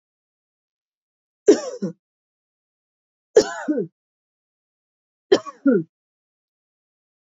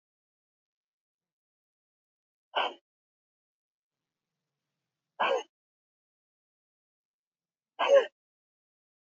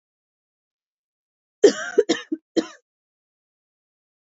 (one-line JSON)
{"three_cough_length": "7.3 s", "three_cough_amplitude": 26947, "three_cough_signal_mean_std_ratio": 0.23, "exhalation_length": "9.0 s", "exhalation_amplitude": 8826, "exhalation_signal_mean_std_ratio": 0.19, "cough_length": "4.4 s", "cough_amplitude": 27205, "cough_signal_mean_std_ratio": 0.21, "survey_phase": "beta (2021-08-13 to 2022-03-07)", "age": "18-44", "gender": "Female", "wearing_mask": "Yes", "symptom_runny_or_blocked_nose": true, "smoker_status": "Never smoked", "respiratory_condition_asthma": false, "respiratory_condition_other": false, "recruitment_source": "Test and Trace", "submission_delay": "2 days", "covid_test_result": "Positive", "covid_test_method": "LFT"}